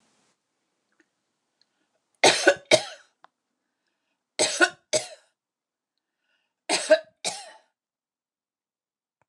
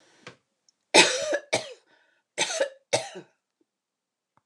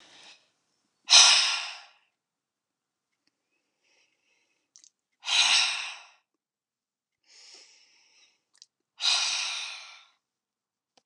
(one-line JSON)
{"three_cough_length": "9.3 s", "three_cough_amplitude": 23487, "three_cough_signal_mean_std_ratio": 0.24, "cough_length": "4.5 s", "cough_amplitude": 28760, "cough_signal_mean_std_ratio": 0.31, "exhalation_length": "11.1 s", "exhalation_amplitude": 24489, "exhalation_signal_mean_std_ratio": 0.29, "survey_phase": "beta (2021-08-13 to 2022-03-07)", "age": "65+", "gender": "Female", "wearing_mask": "No", "symptom_none": true, "smoker_status": "Never smoked", "respiratory_condition_asthma": false, "respiratory_condition_other": false, "recruitment_source": "REACT", "submission_delay": "2 days", "covid_test_result": "Negative", "covid_test_method": "RT-qPCR"}